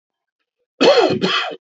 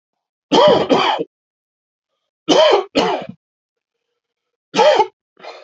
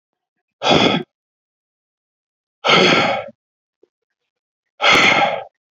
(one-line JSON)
{"cough_length": "1.8 s", "cough_amplitude": 29480, "cough_signal_mean_std_ratio": 0.5, "three_cough_length": "5.6 s", "three_cough_amplitude": 32767, "three_cough_signal_mean_std_ratio": 0.44, "exhalation_length": "5.7 s", "exhalation_amplitude": 29889, "exhalation_signal_mean_std_ratio": 0.43, "survey_phase": "beta (2021-08-13 to 2022-03-07)", "age": "18-44", "gender": "Male", "wearing_mask": "No", "symptom_cough_any": true, "smoker_status": "Ex-smoker", "respiratory_condition_asthma": false, "respiratory_condition_other": false, "recruitment_source": "REACT", "submission_delay": "3 days", "covid_test_result": "Negative", "covid_test_method": "RT-qPCR", "influenza_a_test_result": "Unknown/Void", "influenza_b_test_result": "Unknown/Void"}